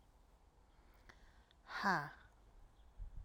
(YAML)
exhalation_length: 3.2 s
exhalation_amplitude: 2432
exhalation_signal_mean_std_ratio: 0.37
survey_phase: alpha (2021-03-01 to 2021-08-12)
age: 45-64
gender: Female
wearing_mask: 'No'
symptom_none: true
smoker_status: Ex-smoker
respiratory_condition_asthma: false
respiratory_condition_other: false
recruitment_source: REACT
submission_delay: 6 days
covid_test_result: Negative
covid_test_method: RT-qPCR